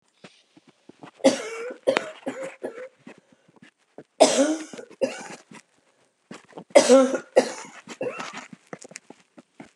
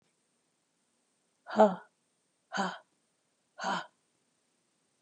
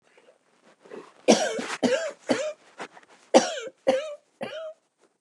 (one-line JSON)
{"three_cough_length": "9.8 s", "three_cough_amplitude": 31337, "three_cough_signal_mean_std_ratio": 0.32, "exhalation_length": "5.0 s", "exhalation_amplitude": 10480, "exhalation_signal_mean_std_ratio": 0.23, "cough_length": "5.2 s", "cough_amplitude": 24514, "cough_signal_mean_std_ratio": 0.4, "survey_phase": "beta (2021-08-13 to 2022-03-07)", "age": "65+", "gender": "Female", "wearing_mask": "No", "symptom_cough_any": true, "symptom_runny_or_blocked_nose": true, "symptom_sore_throat": true, "smoker_status": "Ex-smoker", "respiratory_condition_asthma": false, "respiratory_condition_other": false, "recruitment_source": "REACT", "submission_delay": "1 day", "covid_test_result": "Negative", "covid_test_method": "RT-qPCR", "influenza_a_test_result": "Negative", "influenza_b_test_result": "Negative"}